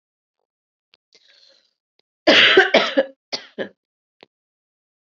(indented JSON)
{
  "three_cough_length": "5.1 s",
  "three_cough_amplitude": 32555,
  "three_cough_signal_mean_std_ratio": 0.29,
  "survey_phase": "beta (2021-08-13 to 2022-03-07)",
  "age": "18-44",
  "gender": "Female",
  "wearing_mask": "No",
  "symptom_cough_any": true,
  "symptom_runny_or_blocked_nose": true,
  "symptom_sore_throat": true,
  "symptom_fatigue": true,
  "symptom_headache": true,
  "symptom_onset": "4 days",
  "smoker_status": "Never smoked",
  "respiratory_condition_asthma": true,
  "respiratory_condition_other": false,
  "recruitment_source": "Test and Trace",
  "submission_delay": "1 day",
  "covid_test_result": "Positive",
  "covid_test_method": "RT-qPCR",
  "covid_ct_value": 31.0,
  "covid_ct_gene": "N gene"
}